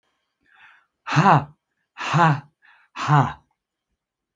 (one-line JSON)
{"exhalation_length": "4.4 s", "exhalation_amplitude": 26272, "exhalation_signal_mean_std_ratio": 0.37, "survey_phase": "beta (2021-08-13 to 2022-03-07)", "age": "65+", "gender": "Male", "wearing_mask": "No", "symptom_none": true, "smoker_status": "Never smoked", "respiratory_condition_asthma": false, "respiratory_condition_other": false, "recruitment_source": "REACT", "submission_delay": "1 day", "covid_test_result": "Negative", "covid_test_method": "RT-qPCR"}